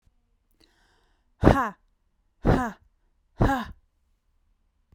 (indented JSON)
{
  "exhalation_length": "4.9 s",
  "exhalation_amplitude": 32768,
  "exhalation_signal_mean_std_ratio": 0.29,
  "survey_phase": "beta (2021-08-13 to 2022-03-07)",
  "age": "18-44",
  "gender": "Female",
  "wearing_mask": "No",
  "symptom_cough_any": true,
  "symptom_sore_throat": true,
  "symptom_fatigue": true,
  "symptom_onset": "3 days",
  "smoker_status": "Never smoked",
  "respiratory_condition_asthma": false,
  "respiratory_condition_other": false,
  "recruitment_source": "Test and Trace",
  "submission_delay": "2 days",
  "covid_test_result": "Positive",
  "covid_test_method": "RT-qPCR"
}